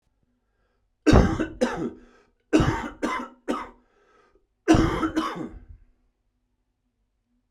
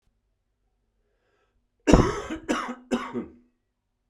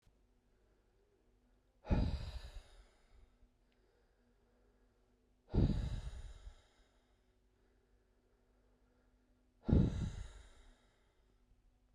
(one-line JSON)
{"three_cough_length": "7.5 s", "three_cough_amplitude": 23476, "three_cough_signal_mean_std_ratio": 0.38, "cough_length": "4.1 s", "cough_amplitude": 32768, "cough_signal_mean_std_ratio": 0.3, "exhalation_length": "11.9 s", "exhalation_amplitude": 4754, "exhalation_signal_mean_std_ratio": 0.3, "survey_phase": "beta (2021-08-13 to 2022-03-07)", "age": "45-64", "gender": "Male", "wearing_mask": "No", "symptom_cough_any": true, "symptom_runny_or_blocked_nose": true, "symptom_sore_throat": true, "symptom_fever_high_temperature": true, "symptom_headache": true, "symptom_loss_of_taste": true, "symptom_onset": "3 days", "smoker_status": "Never smoked", "respiratory_condition_asthma": false, "respiratory_condition_other": false, "recruitment_source": "Test and Trace", "submission_delay": "3 days", "covid_test_result": "Positive", "covid_test_method": "RT-qPCR"}